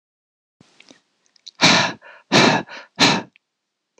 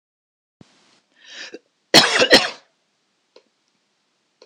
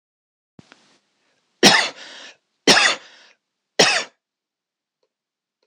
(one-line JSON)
{"exhalation_length": "4.0 s", "exhalation_amplitude": 26028, "exhalation_signal_mean_std_ratio": 0.37, "cough_length": "4.5 s", "cough_amplitude": 26028, "cough_signal_mean_std_ratio": 0.25, "three_cough_length": "5.7 s", "three_cough_amplitude": 26028, "three_cough_signal_mean_std_ratio": 0.29, "survey_phase": "alpha (2021-03-01 to 2021-08-12)", "age": "45-64", "gender": "Male", "wearing_mask": "No", "symptom_none": true, "smoker_status": "Never smoked", "respiratory_condition_asthma": false, "respiratory_condition_other": false, "recruitment_source": "REACT", "submission_delay": "2 days", "covid_test_result": "Negative", "covid_test_method": "RT-qPCR"}